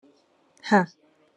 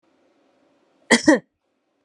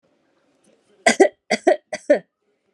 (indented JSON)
{
  "exhalation_length": "1.4 s",
  "exhalation_amplitude": 19269,
  "exhalation_signal_mean_std_ratio": 0.28,
  "cough_length": "2.0 s",
  "cough_amplitude": 28730,
  "cough_signal_mean_std_ratio": 0.25,
  "three_cough_length": "2.7 s",
  "three_cough_amplitude": 32078,
  "three_cough_signal_mean_std_ratio": 0.3,
  "survey_phase": "alpha (2021-03-01 to 2021-08-12)",
  "age": "18-44",
  "gender": "Female",
  "wearing_mask": "No",
  "symptom_none": true,
  "symptom_onset": "3 days",
  "smoker_status": "Never smoked",
  "respiratory_condition_asthma": false,
  "respiratory_condition_other": false,
  "recruitment_source": "REACT",
  "submission_delay": "1 day",
  "covid_test_method": "RT-qPCR"
}